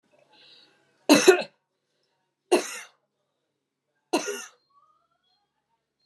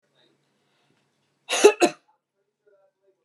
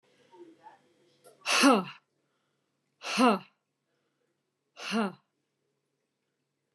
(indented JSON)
{
  "three_cough_length": "6.1 s",
  "three_cough_amplitude": 25550,
  "three_cough_signal_mean_std_ratio": 0.23,
  "cough_length": "3.2 s",
  "cough_amplitude": 29033,
  "cough_signal_mean_std_ratio": 0.21,
  "exhalation_length": "6.7 s",
  "exhalation_amplitude": 11432,
  "exhalation_signal_mean_std_ratio": 0.28,
  "survey_phase": "beta (2021-08-13 to 2022-03-07)",
  "age": "45-64",
  "gender": "Female",
  "wearing_mask": "No",
  "symptom_none": true,
  "symptom_onset": "12 days",
  "smoker_status": "Never smoked",
  "respiratory_condition_asthma": false,
  "respiratory_condition_other": false,
  "recruitment_source": "REACT",
  "submission_delay": "1 day",
  "covid_test_result": "Negative",
  "covid_test_method": "RT-qPCR",
  "influenza_a_test_result": "Negative",
  "influenza_b_test_result": "Negative"
}